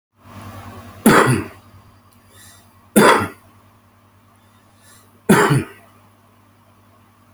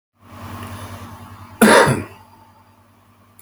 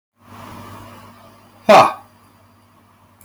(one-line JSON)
{"three_cough_length": "7.3 s", "three_cough_amplitude": 32767, "three_cough_signal_mean_std_ratio": 0.33, "cough_length": "3.4 s", "cough_amplitude": 31976, "cough_signal_mean_std_ratio": 0.35, "exhalation_length": "3.2 s", "exhalation_amplitude": 31601, "exhalation_signal_mean_std_ratio": 0.26, "survey_phase": "beta (2021-08-13 to 2022-03-07)", "age": "45-64", "gender": "Male", "wearing_mask": "No", "symptom_none": true, "smoker_status": "Current smoker (11 or more cigarettes per day)", "respiratory_condition_asthma": false, "respiratory_condition_other": false, "recruitment_source": "REACT", "submission_delay": "1 day", "covid_test_result": "Negative", "covid_test_method": "RT-qPCR"}